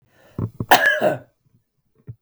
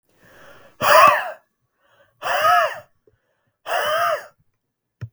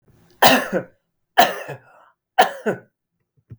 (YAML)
cough_length: 2.2 s
cough_amplitude: 32768
cough_signal_mean_std_ratio: 0.38
exhalation_length: 5.1 s
exhalation_amplitude: 32768
exhalation_signal_mean_std_ratio: 0.42
three_cough_length: 3.6 s
three_cough_amplitude: 32768
three_cough_signal_mean_std_ratio: 0.34
survey_phase: beta (2021-08-13 to 2022-03-07)
age: 45-64
gender: Male
wearing_mask: 'No'
symptom_none: true
smoker_status: Never smoked
respiratory_condition_asthma: false
respiratory_condition_other: false
recruitment_source: REACT
submission_delay: 2 days
covid_test_result: Negative
covid_test_method: RT-qPCR
influenza_a_test_result: Unknown/Void
influenza_b_test_result: Unknown/Void